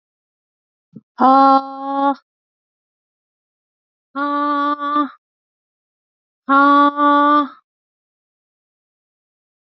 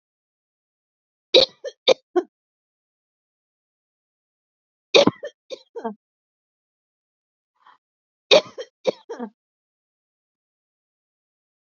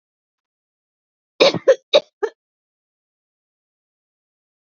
exhalation_length: 9.7 s
exhalation_amplitude: 27631
exhalation_signal_mean_std_ratio: 0.4
three_cough_length: 11.6 s
three_cough_amplitude: 29651
three_cough_signal_mean_std_ratio: 0.18
cough_length: 4.7 s
cough_amplitude: 32767
cough_signal_mean_std_ratio: 0.2
survey_phase: beta (2021-08-13 to 2022-03-07)
age: 45-64
gender: Female
wearing_mask: 'No'
symptom_none: true
smoker_status: Never smoked
respiratory_condition_asthma: false
respiratory_condition_other: false
recruitment_source: REACT
submission_delay: 1 day
covid_test_result: Negative
covid_test_method: RT-qPCR
influenza_a_test_result: Negative
influenza_b_test_result: Negative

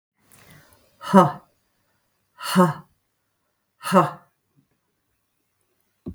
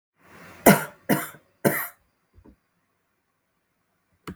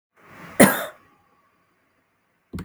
exhalation_length: 6.1 s
exhalation_amplitude: 32766
exhalation_signal_mean_std_ratio: 0.26
three_cough_length: 4.4 s
three_cough_amplitude: 32766
three_cough_signal_mean_std_ratio: 0.24
cough_length: 2.6 s
cough_amplitude: 32766
cough_signal_mean_std_ratio: 0.23
survey_phase: beta (2021-08-13 to 2022-03-07)
age: 65+
gender: Female
wearing_mask: 'No'
symptom_none: true
smoker_status: Ex-smoker
respiratory_condition_asthma: false
respiratory_condition_other: false
recruitment_source: REACT
submission_delay: 1 day
covid_test_result: Negative
covid_test_method: RT-qPCR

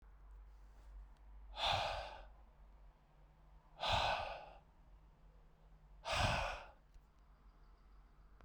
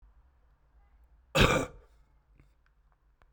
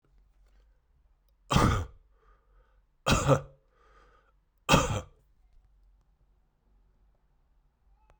exhalation_length: 8.4 s
exhalation_amplitude: 2656
exhalation_signal_mean_std_ratio: 0.48
cough_length: 3.3 s
cough_amplitude: 14423
cough_signal_mean_std_ratio: 0.25
three_cough_length: 8.2 s
three_cough_amplitude: 13064
three_cough_signal_mean_std_ratio: 0.28
survey_phase: beta (2021-08-13 to 2022-03-07)
age: 45-64
gender: Male
wearing_mask: 'No'
symptom_runny_or_blocked_nose: true
symptom_other: true
smoker_status: Current smoker (1 to 10 cigarettes per day)
respiratory_condition_asthma: false
respiratory_condition_other: false
recruitment_source: Test and Trace
submission_delay: 1 day
covid_test_result: Positive
covid_test_method: RT-qPCR
covid_ct_value: 19.4
covid_ct_gene: ORF1ab gene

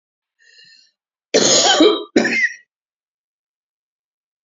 cough_length: 4.4 s
cough_amplitude: 30146
cough_signal_mean_std_ratio: 0.39
survey_phase: beta (2021-08-13 to 2022-03-07)
age: 65+
gender: Female
wearing_mask: 'No'
symptom_none: true
smoker_status: Ex-smoker
respiratory_condition_asthma: false
respiratory_condition_other: false
recruitment_source: REACT
submission_delay: 1 day
covid_test_result: Negative
covid_test_method: RT-qPCR
influenza_a_test_result: Negative
influenza_b_test_result: Negative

